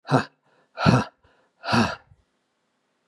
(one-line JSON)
{"exhalation_length": "3.1 s", "exhalation_amplitude": 22656, "exhalation_signal_mean_std_ratio": 0.36, "survey_phase": "beta (2021-08-13 to 2022-03-07)", "age": "65+", "gender": "Male", "wearing_mask": "No", "symptom_cough_any": true, "symptom_runny_or_blocked_nose": true, "smoker_status": "Never smoked", "respiratory_condition_asthma": false, "respiratory_condition_other": false, "recruitment_source": "REACT", "submission_delay": "3 days", "covid_test_result": "Negative", "covid_test_method": "RT-qPCR", "influenza_a_test_result": "Negative", "influenza_b_test_result": "Negative"}